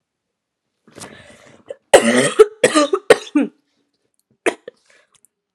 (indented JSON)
{
  "cough_length": "5.5 s",
  "cough_amplitude": 32768,
  "cough_signal_mean_std_ratio": 0.31,
  "survey_phase": "alpha (2021-03-01 to 2021-08-12)",
  "age": "18-44",
  "gender": "Female",
  "wearing_mask": "No",
  "symptom_cough_any": true,
  "symptom_new_continuous_cough": true,
  "symptom_fever_high_temperature": true,
  "symptom_headache": true,
  "symptom_change_to_sense_of_smell_or_taste": true,
  "symptom_loss_of_taste": true,
  "symptom_onset": "3 days",
  "smoker_status": "Never smoked",
  "respiratory_condition_asthma": false,
  "respiratory_condition_other": false,
  "recruitment_source": "Test and Trace",
  "submission_delay": "2 days",
  "covid_test_result": "Positive",
  "covid_test_method": "RT-qPCR",
  "covid_ct_value": 14.0,
  "covid_ct_gene": "ORF1ab gene",
  "covid_ct_mean": 14.4,
  "covid_viral_load": "18000000 copies/ml",
  "covid_viral_load_category": "High viral load (>1M copies/ml)"
}